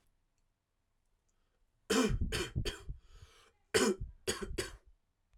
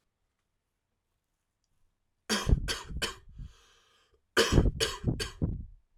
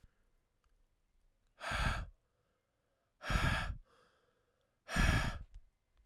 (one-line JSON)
{"three_cough_length": "5.4 s", "three_cough_amplitude": 4702, "three_cough_signal_mean_std_ratio": 0.41, "cough_length": "6.0 s", "cough_amplitude": 10096, "cough_signal_mean_std_ratio": 0.38, "exhalation_length": "6.1 s", "exhalation_amplitude": 4684, "exhalation_signal_mean_std_ratio": 0.39, "survey_phase": "alpha (2021-03-01 to 2021-08-12)", "age": "18-44", "gender": "Male", "wearing_mask": "No", "symptom_cough_any": true, "symptom_headache": true, "smoker_status": "Never smoked", "respiratory_condition_asthma": false, "respiratory_condition_other": false, "recruitment_source": "Test and Trace", "submission_delay": "1 day", "covid_test_result": "Positive", "covid_test_method": "RT-qPCR", "covid_ct_value": 24.0, "covid_ct_gene": "ORF1ab gene", "covid_ct_mean": 24.4, "covid_viral_load": "9800 copies/ml", "covid_viral_load_category": "Minimal viral load (< 10K copies/ml)"}